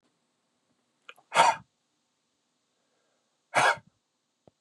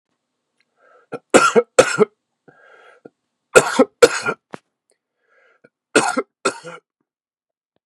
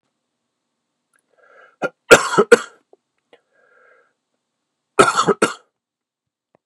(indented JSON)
{
  "exhalation_length": "4.6 s",
  "exhalation_amplitude": 15088,
  "exhalation_signal_mean_std_ratio": 0.23,
  "three_cough_length": "7.9 s",
  "three_cough_amplitude": 32768,
  "three_cough_signal_mean_std_ratio": 0.28,
  "cough_length": "6.7 s",
  "cough_amplitude": 32768,
  "cough_signal_mean_std_ratio": 0.23,
  "survey_phase": "beta (2021-08-13 to 2022-03-07)",
  "age": "45-64",
  "gender": "Male",
  "wearing_mask": "No",
  "symptom_cough_any": true,
  "symptom_runny_or_blocked_nose": true,
  "symptom_onset": "6 days",
  "smoker_status": "Never smoked",
  "respiratory_condition_asthma": false,
  "respiratory_condition_other": false,
  "recruitment_source": "Test and Trace",
  "submission_delay": "1 day",
  "covid_test_result": "Positive",
  "covid_test_method": "ePCR"
}